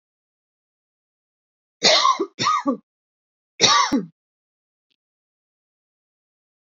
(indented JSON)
{
  "three_cough_length": "6.7 s",
  "three_cough_amplitude": 29334,
  "three_cough_signal_mean_std_ratio": 0.32,
  "survey_phase": "alpha (2021-03-01 to 2021-08-12)",
  "age": "18-44",
  "gender": "Female",
  "wearing_mask": "No",
  "symptom_fatigue": true,
  "symptom_headache": true,
  "smoker_status": "Ex-smoker",
  "respiratory_condition_asthma": false,
  "respiratory_condition_other": false,
  "recruitment_source": "REACT",
  "submission_delay": "1 day",
  "covid_test_result": "Negative",
  "covid_test_method": "RT-qPCR"
}